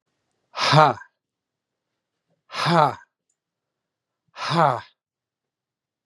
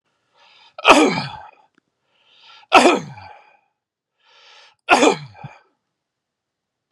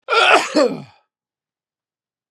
{"exhalation_length": "6.1 s", "exhalation_amplitude": 32337, "exhalation_signal_mean_std_ratio": 0.3, "three_cough_length": "6.9 s", "three_cough_amplitude": 32768, "three_cough_signal_mean_std_ratio": 0.29, "cough_length": "2.3 s", "cough_amplitude": 32318, "cough_signal_mean_std_ratio": 0.41, "survey_phase": "beta (2021-08-13 to 2022-03-07)", "age": "45-64", "gender": "Male", "wearing_mask": "No", "symptom_new_continuous_cough": true, "symptom_runny_or_blocked_nose": true, "symptom_sore_throat": true, "symptom_fever_high_temperature": true, "symptom_headache": true, "symptom_change_to_sense_of_smell_or_taste": true, "symptom_loss_of_taste": true, "symptom_onset": "8 days", "smoker_status": "Never smoked", "respiratory_condition_asthma": false, "respiratory_condition_other": false, "recruitment_source": "Test and Trace", "submission_delay": "1 day", "covid_test_result": "Positive", "covid_test_method": "RT-qPCR", "covid_ct_value": 27.4, "covid_ct_gene": "ORF1ab gene", "covid_ct_mean": 27.7, "covid_viral_load": "810 copies/ml", "covid_viral_load_category": "Minimal viral load (< 10K copies/ml)"}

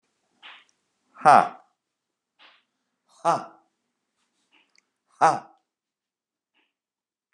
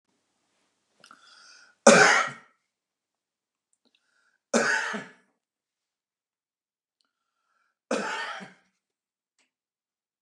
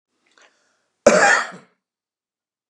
{"exhalation_length": "7.3 s", "exhalation_amplitude": 27357, "exhalation_signal_mean_std_ratio": 0.19, "three_cough_length": "10.2 s", "three_cough_amplitude": 30171, "three_cough_signal_mean_std_ratio": 0.23, "cough_length": "2.7 s", "cough_amplitude": 32768, "cough_signal_mean_std_ratio": 0.3, "survey_phase": "beta (2021-08-13 to 2022-03-07)", "age": "65+", "gender": "Male", "wearing_mask": "No", "symptom_none": true, "smoker_status": "Ex-smoker", "respiratory_condition_asthma": false, "respiratory_condition_other": false, "recruitment_source": "REACT", "submission_delay": "2 days", "covid_test_result": "Negative", "covid_test_method": "RT-qPCR", "influenza_a_test_result": "Negative", "influenza_b_test_result": "Negative"}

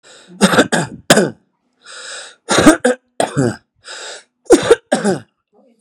{"three_cough_length": "5.8 s", "three_cough_amplitude": 32768, "three_cough_signal_mean_std_ratio": 0.43, "survey_phase": "beta (2021-08-13 to 2022-03-07)", "age": "45-64", "gender": "Male", "wearing_mask": "No", "symptom_shortness_of_breath": true, "smoker_status": "Never smoked", "respiratory_condition_asthma": true, "respiratory_condition_other": false, "recruitment_source": "REACT", "submission_delay": "6 days", "covid_test_result": "Negative", "covid_test_method": "RT-qPCR", "influenza_a_test_result": "Negative", "influenza_b_test_result": "Negative"}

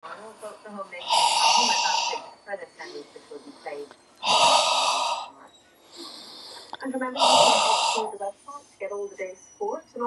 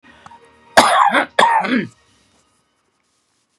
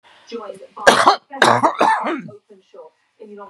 {"exhalation_length": "10.1 s", "exhalation_amplitude": 17824, "exhalation_signal_mean_std_ratio": 0.6, "cough_length": "3.6 s", "cough_amplitude": 32768, "cough_signal_mean_std_ratio": 0.41, "three_cough_length": "3.5 s", "three_cough_amplitude": 32768, "three_cough_signal_mean_std_ratio": 0.45, "survey_phase": "beta (2021-08-13 to 2022-03-07)", "age": "45-64", "gender": "Male", "wearing_mask": "No", "symptom_runny_or_blocked_nose": true, "symptom_shortness_of_breath": true, "symptom_fatigue": true, "smoker_status": "Ex-smoker", "respiratory_condition_asthma": false, "respiratory_condition_other": false, "recruitment_source": "REACT", "submission_delay": "0 days", "covid_test_result": "Negative", "covid_test_method": "RT-qPCR", "influenza_a_test_result": "Negative", "influenza_b_test_result": "Negative"}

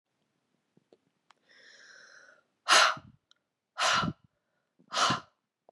{"exhalation_length": "5.7 s", "exhalation_amplitude": 11537, "exhalation_signal_mean_std_ratio": 0.3, "survey_phase": "beta (2021-08-13 to 2022-03-07)", "age": "18-44", "gender": "Female", "wearing_mask": "No", "symptom_cough_any": true, "symptom_runny_or_blocked_nose": true, "symptom_fatigue": true, "symptom_onset": "2 days", "smoker_status": "Ex-smoker", "respiratory_condition_asthma": false, "respiratory_condition_other": false, "recruitment_source": "Test and Trace", "submission_delay": "1 day", "covid_test_result": "Positive", "covid_test_method": "ePCR"}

